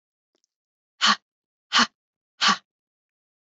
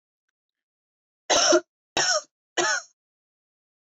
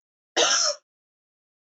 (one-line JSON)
{"exhalation_length": "3.4 s", "exhalation_amplitude": 15873, "exhalation_signal_mean_std_ratio": 0.27, "three_cough_length": "3.9 s", "three_cough_amplitude": 13499, "three_cough_signal_mean_std_ratio": 0.36, "cough_length": "1.7 s", "cough_amplitude": 14752, "cough_signal_mean_std_ratio": 0.39, "survey_phase": "beta (2021-08-13 to 2022-03-07)", "age": "18-44", "gender": "Female", "wearing_mask": "No", "symptom_sore_throat": true, "smoker_status": "Never smoked", "respiratory_condition_asthma": false, "respiratory_condition_other": false, "recruitment_source": "Test and Trace", "submission_delay": "1 day", "covid_test_result": "Positive", "covid_test_method": "RT-qPCR", "covid_ct_value": 26.0, "covid_ct_gene": "ORF1ab gene"}